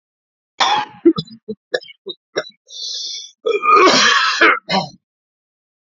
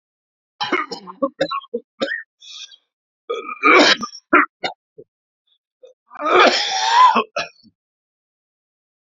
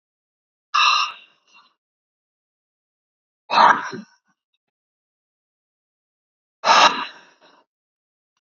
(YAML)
cough_length: 5.9 s
cough_amplitude: 29761
cough_signal_mean_std_ratio: 0.48
three_cough_length: 9.1 s
three_cough_amplitude: 32251
three_cough_signal_mean_std_ratio: 0.4
exhalation_length: 8.4 s
exhalation_amplitude: 27555
exhalation_signal_mean_std_ratio: 0.27
survey_phase: beta (2021-08-13 to 2022-03-07)
age: 45-64
gender: Male
wearing_mask: 'No'
symptom_cough_any: true
symptom_shortness_of_breath: true
symptom_headache: true
smoker_status: Never smoked
respiratory_condition_asthma: true
respiratory_condition_other: false
recruitment_source: Test and Trace
submission_delay: 2 days
covid_test_result: Positive
covid_test_method: RT-qPCR
covid_ct_value: 18.8
covid_ct_gene: N gene